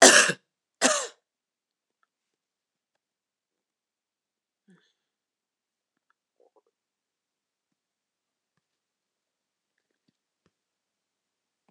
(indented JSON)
{
  "cough_length": "11.7 s",
  "cough_amplitude": 26028,
  "cough_signal_mean_std_ratio": 0.14,
  "survey_phase": "alpha (2021-03-01 to 2021-08-12)",
  "age": "45-64",
  "gender": "Female",
  "wearing_mask": "No",
  "symptom_none": true,
  "smoker_status": "Never smoked",
  "respiratory_condition_asthma": false,
  "respiratory_condition_other": false,
  "recruitment_source": "REACT",
  "submission_delay": "2 days",
  "covid_test_result": "Negative",
  "covid_test_method": "RT-qPCR"
}